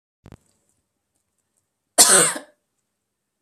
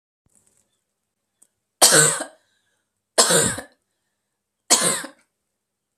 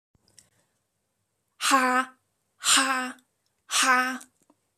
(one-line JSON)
{"cough_length": "3.4 s", "cough_amplitude": 32768, "cough_signal_mean_std_ratio": 0.25, "three_cough_length": "6.0 s", "three_cough_amplitude": 32768, "three_cough_signal_mean_std_ratio": 0.32, "exhalation_length": "4.8 s", "exhalation_amplitude": 13863, "exhalation_signal_mean_std_ratio": 0.42, "survey_phase": "beta (2021-08-13 to 2022-03-07)", "age": "18-44", "gender": "Female", "wearing_mask": "No", "symptom_none": true, "smoker_status": "Never smoked", "respiratory_condition_asthma": false, "respiratory_condition_other": false, "recruitment_source": "REACT", "submission_delay": "0 days", "covid_test_result": "Negative", "covid_test_method": "RT-qPCR", "influenza_a_test_result": "Negative", "influenza_b_test_result": "Negative"}